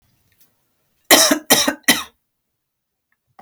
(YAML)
cough_length: 3.4 s
cough_amplitude: 32768
cough_signal_mean_std_ratio: 0.32
survey_phase: beta (2021-08-13 to 2022-03-07)
age: 45-64
gender: Female
wearing_mask: 'No'
symptom_runny_or_blocked_nose: true
symptom_sore_throat: true
symptom_onset: 12 days
smoker_status: Never smoked
respiratory_condition_asthma: false
respiratory_condition_other: false
recruitment_source: REACT
submission_delay: 1 day
covid_test_result: Negative
covid_test_method: RT-qPCR